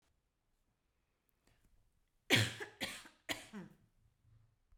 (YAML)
three_cough_length: 4.8 s
three_cough_amplitude: 6598
three_cough_signal_mean_std_ratio: 0.25
survey_phase: beta (2021-08-13 to 2022-03-07)
age: 45-64
gender: Female
wearing_mask: 'No'
symptom_none: true
smoker_status: Never smoked
respiratory_condition_asthma: false
respiratory_condition_other: false
recruitment_source: REACT
submission_delay: 1 day
covid_test_result: Negative
covid_test_method: RT-qPCR